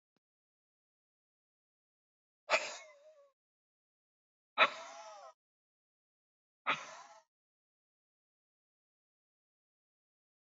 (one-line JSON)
{"exhalation_length": "10.4 s", "exhalation_amplitude": 6291, "exhalation_signal_mean_std_ratio": 0.17, "survey_phase": "beta (2021-08-13 to 2022-03-07)", "age": "45-64", "gender": "Male", "wearing_mask": "No", "symptom_none": true, "smoker_status": "Ex-smoker", "respiratory_condition_asthma": false, "respiratory_condition_other": false, "recruitment_source": "REACT", "submission_delay": "2 days", "covid_test_result": "Negative", "covid_test_method": "RT-qPCR"}